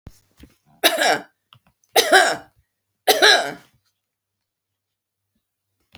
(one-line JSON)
{"three_cough_length": "6.0 s", "three_cough_amplitude": 32767, "three_cough_signal_mean_std_ratio": 0.32, "survey_phase": "alpha (2021-03-01 to 2021-08-12)", "age": "65+", "gender": "Female", "wearing_mask": "No", "symptom_none": true, "smoker_status": "Ex-smoker", "respiratory_condition_asthma": false, "respiratory_condition_other": false, "recruitment_source": "REACT", "submission_delay": "1 day", "covid_test_result": "Negative", "covid_test_method": "RT-qPCR"}